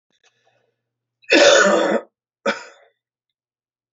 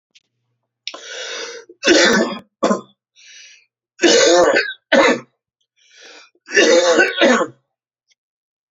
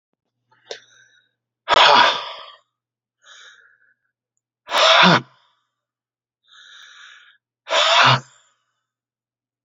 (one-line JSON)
{"cough_length": "3.9 s", "cough_amplitude": 32767, "cough_signal_mean_std_ratio": 0.36, "three_cough_length": "8.7 s", "three_cough_amplitude": 32170, "three_cough_signal_mean_std_ratio": 0.47, "exhalation_length": "9.6 s", "exhalation_amplitude": 29440, "exhalation_signal_mean_std_ratio": 0.33, "survey_phase": "alpha (2021-03-01 to 2021-08-12)", "age": "65+", "gender": "Male", "wearing_mask": "No", "symptom_none": true, "smoker_status": "Ex-smoker", "respiratory_condition_asthma": false, "respiratory_condition_other": false, "recruitment_source": "REACT", "submission_delay": "2 days", "covid_test_result": "Negative", "covid_test_method": "RT-qPCR"}